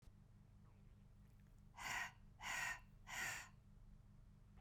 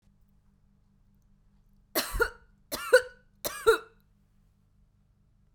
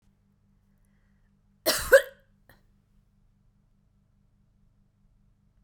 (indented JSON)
{
  "exhalation_length": "4.6 s",
  "exhalation_amplitude": 685,
  "exhalation_signal_mean_std_ratio": 0.61,
  "three_cough_length": "5.5 s",
  "three_cough_amplitude": 15442,
  "three_cough_signal_mean_std_ratio": 0.25,
  "cough_length": "5.6 s",
  "cough_amplitude": 23261,
  "cough_signal_mean_std_ratio": 0.16,
  "survey_phase": "beta (2021-08-13 to 2022-03-07)",
  "age": "45-64",
  "gender": "Female",
  "wearing_mask": "No",
  "symptom_none": true,
  "smoker_status": "Ex-smoker",
  "respiratory_condition_asthma": false,
  "respiratory_condition_other": false,
  "recruitment_source": "REACT",
  "submission_delay": "2 days",
  "covid_test_result": "Negative",
  "covid_test_method": "RT-qPCR",
  "influenza_a_test_result": "Unknown/Void",
  "influenza_b_test_result": "Unknown/Void"
}